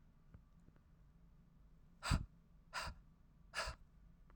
{"exhalation_length": "4.4 s", "exhalation_amplitude": 2614, "exhalation_signal_mean_std_ratio": 0.37, "survey_phase": "alpha (2021-03-01 to 2021-08-12)", "age": "18-44", "gender": "Female", "wearing_mask": "No", "symptom_fatigue": true, "symptom_onset": "13 days", "smoker_status": "Never smoked", "respiratory_condition_asthma": true, "respiratory_condition_other": false, "recruitment_source": "REACT", "submission_delay": "1 day", "covid_test_result": "Negative", "covid_test_method": "RT-qPCR"}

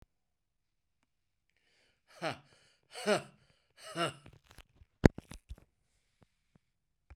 {"exhalation_length": "7.2 s", "exhalation_amplitude": 21118, "exhalation_signal_mean_std_ratio": 0.17, "survey_phase": "beta (2021-08-13 to 2022-03-07)", "age": "65+", "gender": "Male", "wearing_mask": "No", "symptom_none": true, "smoker_status": "Ex-smoker", "respiratory_condition_asthma": false, "respiratory_condition_other": false, "recruitment_source": "REACT", "submission_delay": "3 days", "covid_test_result": "Negative", "covid_test_method": "RT-qPCR"}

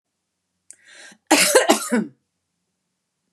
{"cough_length": "3.3 s", "cough_amplitude": 32684, "cough_signal_mean_std_ratio": 0.34, "survey_phase": "beta (2021-08-13 to 2022-03-07)", "age": "65+", "gender": "Female", "wearing_mask": "No", "symptom_none": true, "smoker_status": "Never smoked", "respiratory_condition_asthma": false, "respiratory_condition_other": false, "recruitment_source": "REACT", "submission_delay": "3 days", "covid_test_result": "Negative", "covid_test_method": "RT-qPCR", "influenza_a_test_result": "Negative", "influenza_b_test_result": "Negative"}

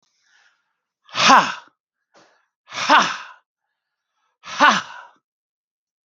{"exhalation_length": "6.1 s", "exhalation_amplitude": 32768, "exhalation_signal_mean_std_ratio": 0.3, "survey_phase": "beta (2021-08-13 to 2022-03-07)", "age": "45-64", "gender": "Male", "wearing_mask": "No", "symptom_none": true, "smoker_status": "Never smoked", "respiratory_condition_asthma": false, "respiratory_condition_other": false, "recruitment_source": "REACT", "submission_delay": "0 days", "covid_test_result": "Negative", "covid_test_method": "RT-qPCR", "influenza_a_test_result": "Negative", "influenza_b_test_result": "Negative"}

